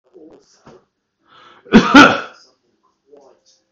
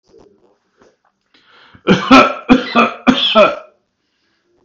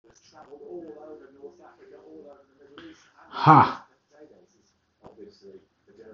cough_length: 3.7 s
cough_amplitude: 32768
cough_signal_mean_std_ratio: 0.27
three_cough_length: 4.6 s
three_cough_amplitude: 32768
three_cough_signal_mean_std_ratio: 0.4
exhalation_length: 6.1 s
exhalation_amplitude: 25283
exhalation_signal_mean_std_ratio: 0.22
survey_phase: beta (2021-08-13 to 2022-03-07)
age: 45-64
gender: Male
wearing_mask: 'No'
symptom_sore_throat: true
smoker_status: Ex-smoker
respiratory_condition_asthma: false
respiratory_condition_other: false
recruitment_source: REACT
submission_delay: 2 days
covid_test_result: Negative
covid_test_method: RT-qPCR
influenza_a_test_result: Negative
influenza_b_test_result: Negative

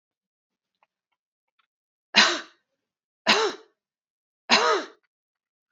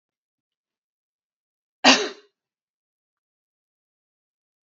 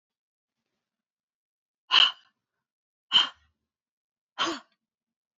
three_cough_length: 5.7 s
three_cough_amplitude: 26351
three_cough_signal_mean_std_ratio: 0.28
cough_length: 4.7 s
cough_amplitude: 29823
cough_signal_mean_std_ratio: 0.15
exhalation_length: 5.4 s
exhalation_amplitude: 16842
exhalation_signal_mean_std_ratio: 0.22
survey_phase: beta (2021-08-13 to 2022-03-07)
age: 45-64
gender: Female
wearing_mask: 'No'
symptom_none: true
smoker_status: Ex-smoker
respiratory_condition_asthma: false
respiratory_condition_other: false
recruitment_source: REACT
submission_delay: 2 days
covid_test_result: Negative
covid_test_method: RT-qPCR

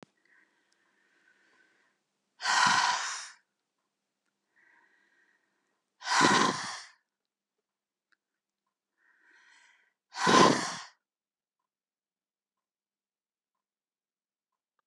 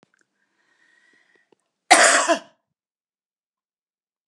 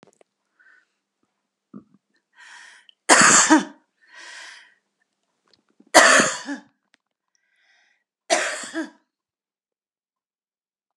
exhalation_length: 14.9 s
exhalation_amplitude: 18008
exhalation_signal_mean_std_ratio: 0.27
cough_length: 4.3 s
cough_amplitude: 32767
cough_signal_mean_std_ratio: 0.24
three_cough_length: 11.0 s
three_cough_amplitude: 32768
three_cough_signal_mean_std_ratio: 0.27
survey_phase: beta (2021-08-13 to 2022-03-07)
age: 65+
gender: Female
wearing_mask: 'No'
symptom_none: true
smoker_status: Never smoked
respiratory_condition_asthma: false
respiratory_condition_other: false
recruitment_source: REACT
submission_delay: 1 day
covid_test_result: Negative
covid_test_method: RT-qPCR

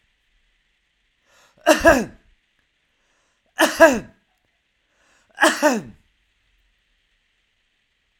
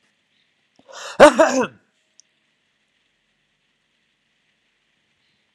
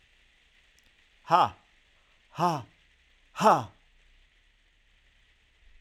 three_cough_length: 8.2 s
three_cough_amplitude: 32768
three_cough_signal_mean_std_ratio: 0.26
cough_length: 5.5 s
cough_amplitude: 32768
cough_signal_mean_std_ratio: 0.19
exhalation_length: 5.8 s
exhalation_amplitude: 15702
exhalation_signal_mean_std_ratio: 0.26
survey_phase: alpha (2021-03-01 to 2021-08-12)
age: 45-64
gender: Male
wearing_mask: 'No'
symptom_none: true
smoker_status: Never smoked
respiratory_condition_asthma: false
respiratory_condition_other: false
recruitment_source: REACT
submission_delay: 1 day
covid_test_result: Negative
covid_test_method: RT-qPCR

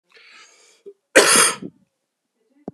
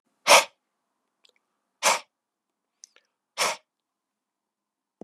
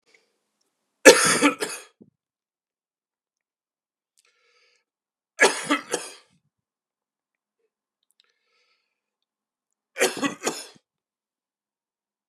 cough_length: 2.7 s
cough_amplitude: 32768
cough_signal_mean_std_ratio: 0.31
exhalation_length: 5.0 s
exhalation_amplitude: 27154
exhalation_signal_mean_std_ratio: 0.21
three_cough_length: 12.3 s
three_cough_amplitude: 32768
three_cough_signal_mean_std_ratio: 0.2
survey_phase: beta (2021-08-13 to 2022-03-07)
age: 45-64
gender: Male
wearing_mask: 'No'
symptom_cough_any: true
symptom_runny_or_blocked_nose: true
symptom_sore_throat: true
symptom_onset: 3 days
smoker_status: Never smoked
respiratory_condition_asthma: false
respiratory_condition_other: false
recruitment_source: Test and Trace
submission_delay: 1 day
covid_test_result: Positive
covid_test_method: RT-qPCR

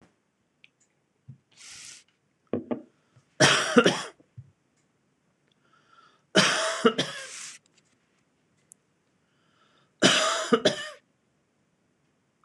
three_cough_length: 12.4 s
three_cough_amplitude: 23506
three_cough_signal_mean_std_ratio: 0.31
survey_phase: beta (2021-08-13 to 2022-03-07)
age: 45-64
gender: Female
wearing_mask: 'No'
symptom_none: true
smoker_status: Never smoked
respiratory_condition_asthma: false
respiratory_condition_other: false
recruitment_source: REACT
submission_delay: 1 day
covid_test_result: Negative
covid_test_method: RT-qPCR
influenza_a_test_result: Negative
influenza_b_test_result: Negative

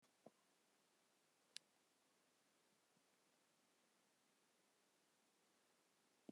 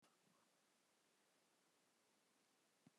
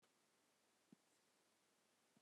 exhalation_length: 6.3 s
exhalation_amplitude: 923
exhalation_signal_mean_std_ratio: 0.37
cough_length: 3.0 s
cough_amplitude: 48
cough_signal_mean_std_ratio: 0.92
three_cough_length: 2.2 s
three_cough_amplitude: 71
three_cough_signal_mean_std_ratio: 0.75
survey_phase: beta (2021-08-13 to 2022-03-07)
age: 45-64
gender: Female
wearing_mask: 'No'
symptom_cough_any: true
symptom_new_continuous_cough: true
symptom_runny_or_blocked_nose: true
symptom_sore_throat: true
symptom_diarrhoea: true
symptom_fatigue: true
symptom_fever_high_temperature: true
symptom_headache: true
symptom_change_to_sense_of_smell_or_taste: true
symptom_loss_of_taste: true
symptom_onset: 4 days
smoker_status: Never smoked
respiratory_condition_asthma: false
respiratory_condition_other: false
recruitment_source: Test and Trace
submission_delay: 2 days
covid_test_result: Positive
covid_test_method: RT-qPCR
covid_ct_value: 14.2
covid_ct_gene: ORF1ab gene
covid_ct_mean: 14.5
covid_viral_load: 18000000 copies/ml
covid_viral_load_category: High viral load (>1M copies/ml)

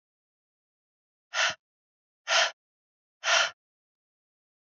exhalation_length: 4.8 s
exhalation_amplitude: 10864
exhalation_signal_mean_std_ratio: 0.29
survey_phase: alpha (2021-03-01 to 2021-08-12)
age: 18-44
gender: Female
wearing_mask: 'No'
symptom_cough_any: true
symptom_fatigue: true
symptom_headache: true
symptom_onset: 3 days
smoker_status: Never smoked
respiratory_condition_asthma: false
respiratory_condition_other: false
recruitment_source: Test and Trace
submission_delay: 1 day
covid_test_result: Positive
covid_test_method: RT-qPCR
covid_ct_value: 20.3
covid_ct_gene: ORF1ab gene
covid_ct_mean: 20.5
covid_viral_load: 180000 copies/ml
covid_viral_load_category: Low viral load (10K-1M copies/ml)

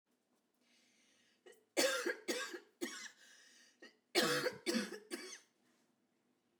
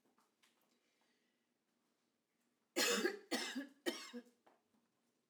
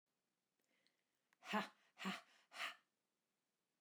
cough_length: 6.6 s
cough_amplitude: 3618
cough_signal_mean_std_ratio: 0.4
three_cough_length: 5.3 s
three_cough_amplitude: 2126
three_cough_signal_mean_std_ratio: 0.33
exhalation_length: 3.8 s
exhalation_amplitude: 1198
exhalation_signal_mean_std_ratio: 0.3
survey_phase: alpha (2021-03-01 to 2021-08-12)
age: 45-64
gender: Female
wearing_mask: 'No'
symptom_headache: true
smoker_status: Ex-smoker
respiratory_condition_asthma: false
respiratory_condition_other: false
recruitment_source: REACT
submission_delay: 2 days
covid_test_result: Negative
covid_test_method: RT-qPCR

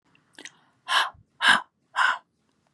exhalation_length: 2.7 s
exhalation_amplitude: 21837
exhalation_signal_mean_std_ratio: 0.37
survey_phase: beta (2021-08-13 to 2022-03-07)
age: 18-44
gender: Female
wearing_mask: 'No'
symptom_cough_any: true
symptom_runny_or_blocked_nose: true
symptom_sore_throat: true
symptom_fatigue: true
symptom_headache: true
smoker_status: Current smoker (11 or more cigarettes per day)
respiratory_condition_asthma: false
respiratory_condition_other: false
recruitment_source: Test and Trace
submission_delay: 1 day
covid_test_result: Positive
covid_test_method: LFT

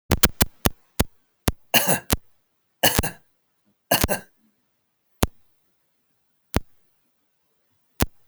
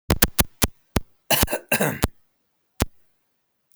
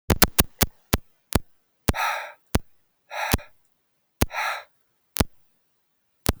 three_cough_length: 8.3 s
three_cough_amplitude: 32768
three_cough_signal_mean_std_ratio: 0.26
cough_length: 3.8 s
cough_amplitude: 32767
cough_signal_mean_std_ratio: 0.33
exhalation_length: 6.4 s
exhalation_amplitude: 32767
exhalation_signal_mean_std_ratio: 0.29
survey_phase: beta (2021-08-13 to 2022-03-07)
age: 45-64
gender: Male
wearing_mask: 'No'
symptom_none: true
smoker_status: Never smoked
respiratory_condition_asthma: false
respiratory_condition_other: false
recruitment_source: REACT
submission_delay: 1 day
covid_test_result: Negative
covid_test_method: RT-qPCR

